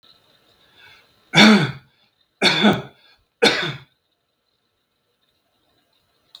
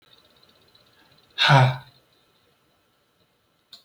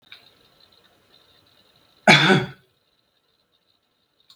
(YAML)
three_cough_length: 6.4 s
three_cough_amplitude: 32768
three_cough_signal_mean_std_ratio: 0.3
exhalation_length: 3.8 s
exhalation_amplitude: 23493
exhalation_signal_mean_std_ratio: 0.26
cough_length: 4.4 s
cough_amplitude: 32768
cough_signal_mean_std_ratio: 0.23
survey_phase: beta (2021-08-13 to 2022-03-07)
age: 65+
gender: Male
wearing_mask: 'No'
symptom_none: true
smoker_status: Ex-smoker
respiratory_condition_asthma: false
respiratory_condition_other: false
recruitment_source: REACT
submission_delay: 2 days
covid_test_result: Negative
covid_test_method: RT-qPCR
influenza_a_test_result: Negative
influenza_b_test_result: Negative